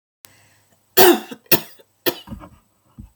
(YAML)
three_cough_length: 3.2 s
three_cough_amplitude: 32768
three_cough_signal_mean_std_ratio: 0.28
survey_phase: beta (2021-08-13 to 2022-03-07)
age: 18-44
gender: Female
wearing_mask: 'No'
symptom_cough_any: true
symptom_runny_or_blocked_nose: true
symptom_sore_throat: true
symptom_diarrhoea: true
symptom_fatigue: true
symptom_headache: true
symptom_other: true
smoker_status: Never smoked
respiratory_condition_asthma: false
respiratory_condition_other: false
recruitment_source: Test and Trace
submission_delay: 2 days
covid_test_result: Positive
covid_test_method: RT-qPCR
covid_ct_value: 31.4
covid_ct_gene: N gene